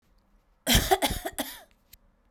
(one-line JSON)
{"three_cough_length": "2.3 s", "three_cough_amplitude": 14659, "three_cough_signal_mean_std_ratio": 0.38, "survey_phase": "beta (2021-08-13 to 2022-03-07)", "age": "18-44", "gender": "Female", "wearing_mask": "No", "symptom_cough_any": true, "symptom_fatigue": true, "symptom_change_to_sense_of_smell_or_taste": true, "symptom_loss_of_taste": true, "symptom_onset": "4 days", "smoker_status": "Never smoked", "respiratory_condition_asthma": false, "respiratory_condition_other": false, "recruitment_source": "Test and Trace", "submission_delay": "3 days", "covid_test_result": "Positive", "covid_test_method": "RT-qPCR"}